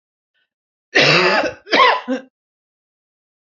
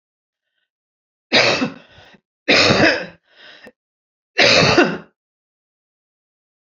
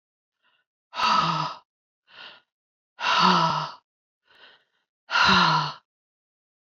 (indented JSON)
{
  "cough_length": "3.4 s",
  "cough_amplitude": 30526,
  "cough_signal_mean_std_ratio": 0.44,
  "three_cough_length": "6.7 s",
  "three_cough_amplitude": 32767,
  "three_cough_signal_mean_std_ratio": 0.38,
  "exhalation_length": "6.7 s",
  "exhalation_amplitude": 18127,
  "exhalation_signal_mean_std_ratio": 0.43,
  "survey_phase": "beta (2021-08-13 to 2022-03-07)",
  "age": "65+",
  "gender": "Female",
  "wearing_mask": "No",
  "symptom_cough_any": true,
  "symptom_runny_or_blocked_nose": true,
  "symptom_shortness_of_breath": true,
  "symptom_fatigue": true,
  "symptom_onset": "7 days",
  "smoker_status": "Ex-smoker",
  "respiratory_condition_asthma": false,
  "respiratory_condition_other": false,
  "recruitment_source": "Test and Trace",
  "submission_delay": "1 day",
  "covid_test_result": "Positive",
  "covid_test_method": "RT-qPCR",
  "covid_ct_value": 29.9,
  "covid_ct_gene": "N gene"
}